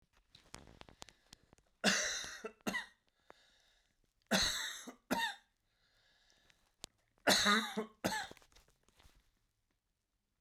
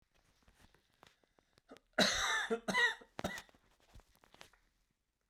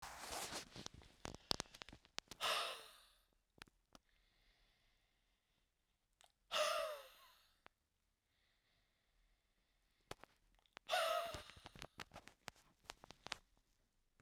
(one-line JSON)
{"three_cough_length": "10.4 s", "three_cough_amplitude": 6003, "three_cough_signal_mean_std_ratio": 0.35, "cough_length": "5.3 s", "cough_amplitude": 4913, "cough_signal_mean_std_ratio": 0.35, "exhalation_length": "14.2 s", "exhalation_amplitude": 6961, "exhalation_signal_mean_std_ratio": 0.33, "survey_phase": "beta (2021-08-13 to 2022-03-07)", "age": "65+", "gender": "Male", "wearing_mask": "No", "symptom_cough_any": true, "symptom_runny_or_blocked_nose": true, "symptom_change_to_sense_of_smell_or_taste": true, "symptom_onset": "3 days", "smoker_status": "Never smoked", "respiratory_condition_asthma": false, "respiratory_condition_other": false, "recruitment_source": "Test and Trace", "submission_delay": "1 day", "covid_test_result": "Positive", "covid_test_method": "RT-qPCR", "covid_ct_value": 16.1, "covid_ct_gene": "ORF1ab gene", "covid_ct_mean": 16.7, "covid_viral_load": "3400000 copies/ml", "covid_viral_load_category": "High viral load (>1M copies/ml)"}